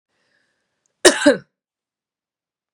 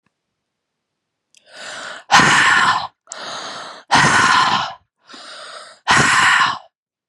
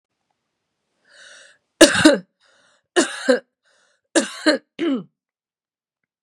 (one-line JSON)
{"cough_length": "2.7 s", "cough_amplitude": 32768, "cough_signal_mean_std_ratio": 0.22, "exhalation_length": "7.1 s", "exhalation_amplitude": 32767, "exhalation_signal_mean_std_ratio": 0.52, "three_cough_length": "6.2 s", "three_cough_amplitude": 32768, "three_cough_signal_mean_std_ratio": 0.3, "survey_phase": "beta (2021-08-13 to 2022-03-07)", "age": "18-44", "gender": "Female", "wearing_mask": "No", "symptom_cough_any": true, "symptom_runny_or_blocked_nose": true, "symptom_sore_throat": true, "symptom_fatigue": true, "symptom_fever_high_temperature": true, "symptom_change_to_sense_of_smell_or_taste": true, "symptom_onset": "3 days", "smoker_status": "Never smoked", "respiratory_condition_asthma": false, "respiratory_condition_other": false, "recruitment_source": "Test and Trace", "submission_delay": "1 day", "covid_test_result": "Positive", "covid_test_method": "ePCR"}